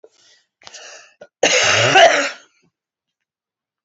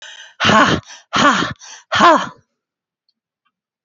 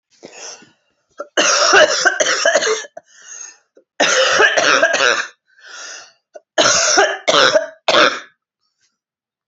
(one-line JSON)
{"cough_length": "3.8 s", "cough_amplitude": 29009, "cough_signal_mean_std_ratio": 0.39, "exhalation_length": "3.8 s", "exhalation_amplitude": 28999, "exhalation_signal_mean_std_ratio": 0.44, "three_cough_length": "9.5 s", "three_cough_amplitude": 30935, "three_cough_signal_mean_std_ratio": 0.56, "survey_phase": "alpha (2021-03-01 to 2021-08-12)", "age": "18-44", "gender": "Female", "wearing_mask": "No", "symptom_new_continuous_cough": true, "symptom_fatigue": true, "symptom_fever_high_temperature": true, "symptom_headache": true, "symptom_loss_of_taste": true, "symptom_onset": "4 days", "smoker_status": "Never smoked", "respiratory_condition_asthma": false, "respiratory_condition_other": false, "recruitment_source": "Test and Trace", "submission_delay": "2 days", "covid_test_result": "Positive", "covid_test_method": "RT-qPCR"}